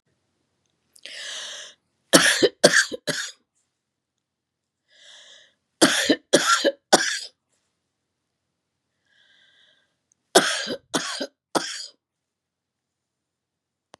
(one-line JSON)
{"three_cough_length": "14.0 s", "three_cough_amplitude": 32767, "three_cough_signal_mean_std_ratio": 0.3, "survey_phase": "beta (2021-08-13 to 2022-03-07)", "age": "65+", "gender": "Female", "wearing_mask": "No", "symptom_none": true, "smoker_status": "Never smoked", "respiratory_condition_asthma": false, "respiratory_condition_other": false, "recruitment_source": "REACT", "submission_delay": "2 days", "covid_test_result": "Negative", "covid_test_method": "RT-qPCR", "influenza_a_test_result": "Unknown/Void", "influenza_b_test_result": "Unknown/Void"}